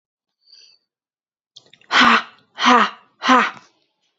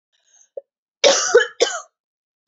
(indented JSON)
{
  "exhalation_length": "4.2 s",
  "exhalation_amplitude": 29247,
  "exhalation_signal_mean_std_ratio": 0.36,
  "cough_length": "2.5 s",
  "cough_amplitude": 29927,
  "cough_signal_mean_std_ratio": 0.35,
  "survey_phase": "beta (2021-08-13 to 2022-03-07)",
  "age": "18-44",
  "gender": "Female",
  "wearing_mask": "No",
  "symptom_cough_any": true,
  "symptom_new_continuous_cough": true,
  "symptom_runny_or_blocked_nose": true,
  "symptom_sore_throat": true,
  "symptom_abdominal_pain": true,
  "symptom_fatigue": true,
  "symptom_headache": true,
  "smoker_status": "Never smoked",
  "respiratory_condition_asthma": false,
  "respiratory_condition_other": false,
  "recruitment_source": "Test and Trace",
  "submission_delay": "2 days",
  "covid_test_result": "Positive",
  "covid_test_method": "RT-qPCR",
  "covid_ct_value": 22.7,
  "covid_ct_gene": "N gene",
  "covid_ct_mean": 22.9,
  "covid_viral_load": "30000 copies/ml",
  "covid_viral_load_category": "Low viral load (10K-1M copies/ml)"
}